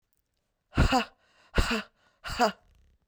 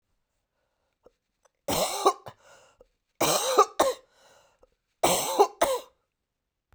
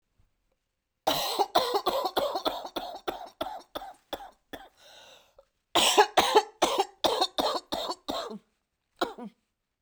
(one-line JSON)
{"exhalation_length": "3.1 s", "exhalation_amplitude": 12652, "exhalation_signal_mean_std_ratio": 0.37, "three_cough_length": "6.7 s", "three_cough_amplitude": 20449, "three_cough_signal_mean_std_ratio": 0.37, "cough_length": "9.8 s", "cough_amplitude": 16116, "cough_signal_mean_std_ratio": 0.45, "survey_phase": "beta (2021-08-13 to 2022-03-07)", "age": "45-64", "gender": "Female", "wearing_mask": "No", "symptom_cough_any": true, "symptom_runny_or_blocked_nose": true, "symptom_sore_throat": true, "symptom_abdominal_pain": true, "symptom_fatigue": true, "symptom_headache": true, "symptom_change_to_sense_of_smell_or_taste": true, "symptom_other": true, "symptom_onset": "5 days", "smoker_status": "Never smoked", "respiratory_condition_asthma": false, "respiratory_condition_other": false, "recruitment_source": "Test and Trace", "submission_delay": "2 days", "covid_test_result": "Positive", "covid_test_method": "RT-qPCR"}